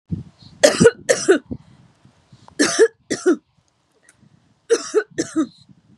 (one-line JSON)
{"three_cough_length": "6.0 s", "three_cough_amplitude": 32768, "three_cough_signal_mean_std_ratio": 0.37, "survey_phase": "beta (2021-08-13 to 2022-03-07)", "age": "45-64", "gender": "Female", "wearing_mask": "No", "symptom_none": true, "smoker_status": "Ex-smoker", "respiratory_condition_asthma": false, "respiratory_condition_other": false, "recruitment_source": "REACT", "submission_delay": "1 day", "covid_test_result": "Negative", "covid_test_method": "RT-qPCR"}